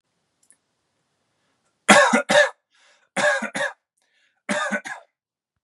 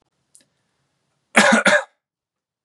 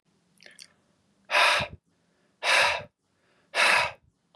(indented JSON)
{
  "three_cough_length": "5.6 s",
  "three_cough_amplitude": 32767,
  "three_cough_signal_mean_std_ratio": 0.34,
  "cough_length": "2.6 s",
  "cough_amplitude": 32767,
  "cough_signal_mean_std_ratio": 0.32,
  "exhalation_length": "4.4 s",
  "exhalation_amplitude": 15929,
  "exhalation_signal_mean_std_ratio": 0.41,
  "survey_phase": "beta (2021-08-13 to 2022-03-07)",
  "age": "18-44",
  "gender": "Male",
  "wearing_mask": "No",
  "symptom_none": true,
  "smoker_status": "Never smoked",
  "respiratory_condition_asthma": false,
  "respiratory_condition_other": false,
  "recruitment_source": "REACT",
  "submission_delay": "1 day",
  "covid_test_result": "Negative",
  "covid_test_method": "RT-qPCR",
  "influenza_a_test_result": "Negative",
  "influenza_b_test_result": "Negative"
}